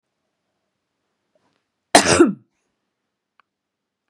{
  "cough_length": "4.1 s",
  "cough_amplitude": 32768,
  "cough_signal_mean_std_ratio": 0.21,
  "survey_phase": "beta (2021-08-13 to 2022-03-07)",
  "age": "45-64",
  "gender": "Female",
  "wearing_mask": "No",
  "symptom_none": true,
  "smoker_status": "Never smoked",
  "respiratory_condition_asthma": false,
  "respiratory_condition_other": false,
  "recruitment_source": "REACT",
  "submission_delay": "1 day",
  "covid_test_result": "Negative",
  "covid_test_method": "RT-qPCR",
  "influenza_a_test_result": "Negative",
  "influenza_b_test_result": "Negative"
}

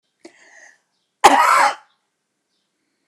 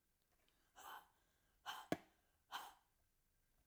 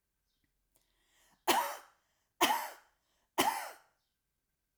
{
  "cough_length": "3.1 s",
  "cough_amplitude": 29204,
  "cough_signal_mean_std_ratio": 0.32,
  "exhalation_length": "3.7 s",
  "exhalation_amplitude": 1937,
  "exhalation_signal_mean_std_ratio": 0.29,
  "three_cough_length": "4.8 s",
  "three_cough_amplitude": 7305,
  "three_cough_signal_mean_std_ratio": 0.31,
  "survey_phase": "alpha (2021-03-01 to 2021-08-12)",
  "age": "65+",
  "gender": "Female",
  "wearing_mask": "No",
  "symptom_none": true,
  "smoker_status": "Never smoked",
  "respiratory_condition_asthma": false,
  "respiratory_condition_other": false,
  "recruitment_source": "REACT",
  "submission_delay": "2 days",
  "covid_test_result": "Negative",
  "covid_test_method": "RT-qPCR"
}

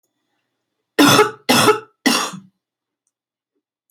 {
  "three_cough_length": "3.9 s",
  "three_cough_amplitude": 31074,
  "three_cough_signal_mean_std_ratio": 0.37,
  "survey_phase": "beta (2021-08-13 to 2022-03-07)",
  "age": "45-64",
  "gender": "Female",
  "wearing_mask": "No",
  "symptom_cough_any": true,
  "symptom_onset": "5 days",
  "smoker_status": "Never smoked",
  "respiratory_condition_asthma": false,
  "respiratory_condition_other": false,
  "recruitment_source": "REACT",
  "submission_delay": "2 days",
  "covid_test_result": "Negative",
  "covid_test_method": "RT-qPCR",
  "influenza_a_test_result": "Negative",
  "influenza_b_test_result": "Negative"
}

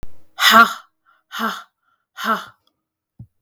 {
  "exhalation_length": "3.4 s",
  "exhalation_amplitude": 32768,
  "exhalation_signal_mean_std_ratio": 0.34,
  "survey_phase": "beta (2021-08-13 to 2022-03-07)",
  "age": "18-44",
  "gender": "Female",
  "wearing_mask": "No",
  "symptom_runny_or_blocked_nose": true,
  "symptom_fatigue": true,
  "symptom_fever_high_temperature": true,
  "symptom_headache": true,
  "smoker_status": "Never smoked",
  "respiratory_condition_asthma": false,
  "respiratory_condition_other": false,
  "recruitment_source": "REACT",
  "submission_delay": "0 days",
  "covid_test_result": "Negative",
  "covid_test_method": "RT-qPCR",
  "influenza_a_test_result": "Negative",
  "influenza_b_test_result": "Negative"
}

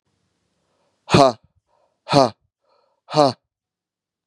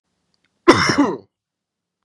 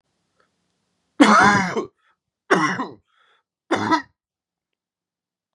{
  "exhalation_length": "4.3 s",
  "exhalation_amplitude": 32767,
  "exhalation_signal_mean_std_ratio": 0.26,
  "cough_length": "2.0 s",
  "cough_amplitude": 32768,
  "cough_signal_mean_std_ratio": 0.34,
  "three_cough_length": "5.5 s",
  "three_cough_amplitude": 29410,
  "three_cough_signal_mean_std_ratio": 0.35,
  "survey_phase": "beta (2021-08-13 to 2022-03-07)",
  "age": "18-44",
  "gender": "Male",
  "wearing_mask": "No",
  "symptom_cough_any": true,
  "symptom_runny_or_blocked_nose": true,
  "symptom_sore_throat": true,
  "symptom_fatigue": true,
  "symptom_headache": true,
  "smoker_status": "Never smoked",
  "respiratory_condition_asthma": false,
  "respiratory_condition_other": false,
  "recruitment_source": "Test and Trace",
  "submission_delay": "1 day",
  "covid_test_result": "Positive",
  "covid_test_method": "LFT"
}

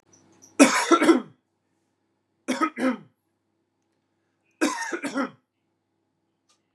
{
  "three_cough_length": "6.7 s",
  "three_cough_amplitude": 30545,
  "three_cough_signal_mean_std_ratio": 0.32,
  "survey_phase": "beta (2021-08-13 to 2022-03-07)",
  "age": "18-44",
  "gender": "Male",
  "wearing_mask": "No",
  "symptom_cough_any": true,
  "symptom_runny_or_blocked_nose": true,
  "symptom_onset": "10 days",
  "smoker_status": "Never smoked",
  "respiratory_condition_asthma": false,
  "respiratory_condition_other": false,
  "recruitment_source": "REACT",
  "submission_delay": "2 days",
  "covid_test_result": "Negative",
  "covid_test_method": "RT-qPCR",
  "influenza_a_test_result": "Negative",
  "influenza_b_test_result": "Negative"
}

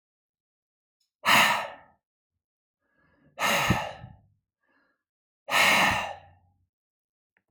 {
  "exhalation_length": "7.5 s",
  "exhalation_amplitude": 16470,
  "exhalation_signal_mean_std_ratio": 0.36,
  "survey_phase": "alpha (2021-03-01 to 2021-08-12)",
  "age": "45-64",
  "gender": "Male",
  "wearing_mask": "No",
  "symptom_none": true,
  "smoker_status": "Never smoked",
  "respiratory_condition_asthma": false,
  "respiratory_condition_other": false,
  "recruitment_source": "REACT",
  "submission_delay": "1 day",
  "covid_test_result": "Negative",
  "covid_test_method": "RT-qPCR"
}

